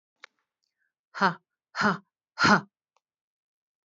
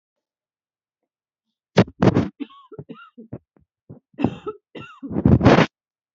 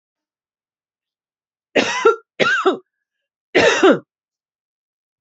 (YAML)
exhalation_length: 3.8 s
exhalation_amplitude: 16943
exhalation_signal_mean_std_ratio: 0.27
cough_length: 6.1 s
cough_amplitude: 27629
cough_signal_mean_std_ratio: 0.31
three_cough_length: 5.2 s
three_cough_amplitude: 28270
three_cough_signal_mean_std_ratio: 0.36
survey_phase: beta (2021-08-13 to 2022-03-07)
age: 45-64
gender: Female
wearing_mask: 'No'
symptom_none: true
smoker_status: Current smoker (1 to 10 cigarettes per day)
respiratory_condition_asthma: false
respiratory_condition_other: false
recruitment_source: REACT
submission_delay: 1 day
covid_test_result: Negative
covid_test_method: RT-qPCR
influenza_a_test_result: Negative
influenza_b_test_result: Negative